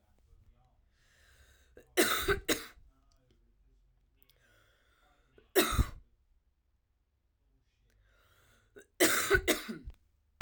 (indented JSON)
{
  "three_cough_length": "10.4 s",
  "three_cough_amplitude": 8846,
  "three_cough_signal_mean_std_ratio": 0.3,
  "survey_phase": "beta (2021-08-13 to 2022-03-07)",
  "age": "18-44",
  "gender": "Female",
  "wearing_mask": "No",
  "symptom_cough_any": true,
  "symptom_runny_or_blocked_nose": true,
  "symptom_sore_throat": true,
  "symptom_fatigue": true,
  "symptom_onset": "4 days",
  "smoker_status": "Ex-smoker",
  "respiratory_condition_asthma": false,
  "respiratory_condition_other": false,
  "recruitment_source": "Test and Trace",
  "submission_delay": "2 days",
  "covid_test_result": "Positive",
  "covid_test_method": "ePCR"
}